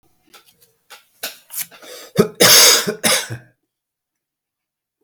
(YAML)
cough_length: 5.0 s
cough_amplitude: 32768
cough_signal_mean_std_ratio: 0.34
survey_phase: beta (2021-08-13 to 2022-03-07)
age: 65+
gender: Male
wearing_mask: 'No'
symptom_cough_any: true
smoker_status: Ex-smoker
respiratory_condition_asthma: false
respiratory_condition_other: false
recruitment_source: Test and Trace
submission_delay: 2 days
covid_test_result: Positive
covid_test_method: RT-qPCR
covid_ct_value: 23.9
covid_ct_gene: N gene